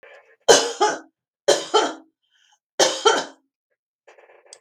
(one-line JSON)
{"three_cough_length": "4.6 s", "three_cough_amplitude": 32768, "three_cough_signal_mean_std_ratio": 0.36, "survey_phase": "beta (2021-08-13 to 2022-03-07)", "age": "65+", "gender": "Female", "wearing_mask": "No", "symptom_none": true, "smoker_status": "Ex-smoker", "respiratory_condition_asthma": false, "respiratory_condition_other": false, "recruitment_source": "REACT", "submission_delay": "2 days", "covid_test_result": "Negative", "covid_test_method": "RT-qPCR", "influenza_a_test_result": "Negative", "influenza_b_test_result": "Negative"}